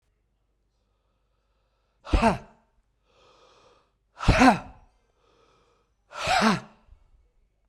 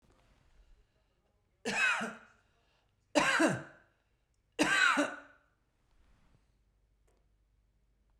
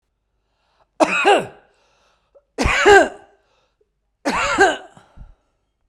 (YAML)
exhalation_length: 7.7 s
exhalation_amplitude: 20621
exhalation_signal_mean_std_ratio: 0.28
three_cough_length: 8.2 s
three_cough_amplitude: 9417
three_cough_signal_mean_std_ratio: 0.34
cough_length: 5.9 s
cough_amplitude: 32768
cough_signal_mean_std_ratio: 0.36
survey_phase: beta (2021-08-13 to 2022-03-07)
age: 45-64
gender: Male
wearing_mask: 'No'
symptom_none: true
smoker_status: Never smoked
respiratory_condition_asthma: false
respiratory_condition_other: false
recruitment_source: REACT
submission_delay: 1 day
covid_test_result: Negative
covid_test_method: RT-qPCR
influenza_a_test_result: Unknown/Void
influenza_b_test_result: Unknown/Void